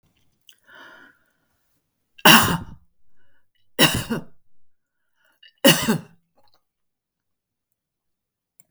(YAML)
three_cough_length: 8.7 s
three_cough_amplitude: 32768
three_cough_signal_mean_std_ratio: 0.25
survey_phase: alpha (2021-03-01 to 2021-08-12)
age: 65+
gender: Female
wearing_mask: 'No'
symptom_none: true
smoker_status: Never smoked
respiratory_condition_asthma: false
respiratory_condition_other: false
recruitment_source: REACT
submission_delay: 1 day
covid_test_result: Negative
covid_test_method: RT-qPCR